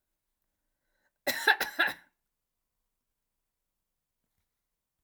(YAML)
cough_length: 5.0 s
cough_amplitude: 12342
cough_signal_mean_std_ratio: 0.21
survey_phase: alpha (2021-03-01 to 2021-08-12)
age: 65+
gender: Female
wearing_mask: 'No'
symptom_none: true
smoker_status: Never smoked
respiratory_condition_asthma: false
respiratory_condition_other: false
recruitment_source: REACT
submission_delay: 2 days
covid_test_result: Negative
covid_test_method: RT-qPCR